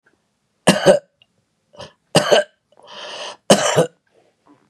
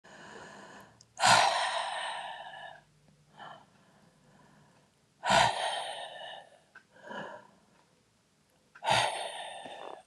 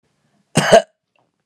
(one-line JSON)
{"three_cough_length": "4.7 s", "three_cough_amplitude": 32768, "three_cough_signal_mean_std_ratio": 0.35, "exhalation_length": "10.1 s", "exhalation_amplitude": 10782, "exhalation_signal_mean_std_ratio": 0.41, "cough_length": "1.5 s", "cough_amplitude": 32768, "cough_signal_mean_std_ratio": 0.3, "survey_phase": "beta (2021-08-13 to 2022-03-07)", "age": "45-64", "gender": "Female", "wearing_mask": "No", "symptom_none": true, "smoker_status": "Current smoker (11 or more cigarettes per day)", "respiratory_condition_asthma": false, "respiratory_condition_other": false, "recruitment_source": "REACT", "submission_delay": "1 day", "covid_test_result": "Negative", "covid_test_method": "RT-qPCR", "influenza_a_test_result": "Negative", "influenza_b_test_result": "Negative"}